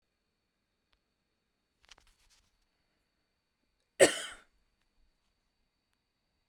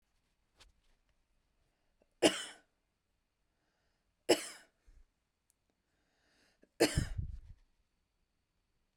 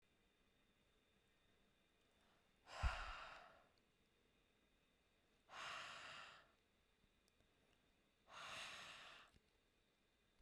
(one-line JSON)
{"cough_length": "6.5 s", "cough_amplitude": 16054, "cough_signal_mean_std_ratio": 0.12, "three_cough_length": "9.0 s", "three_cough_amplitude": 8507, "three_cough_signal_mean_std_ratio": 0.2, "exhalation_length": "10.4 s", "exhalation_amplitude": 1026, "exhalation_signal_mean_std_ratio": 0.36, "survey_phase": "beta (2021-08-13 to 2022-03-07)", "age": "18-44", "gender": "Female", "wearing_mask": "No", "symptom_other": true, "symptom_onset": "12 days", "smoker_status": "Ex-smoker", "respiratory_condition_asthma": true, "respiratory_condition_other": false, "recruitment_source": "REACT", "submission_delay": "1 day", "covid_test_result": "Negative", "covid_test_method": "RT-qPCR"}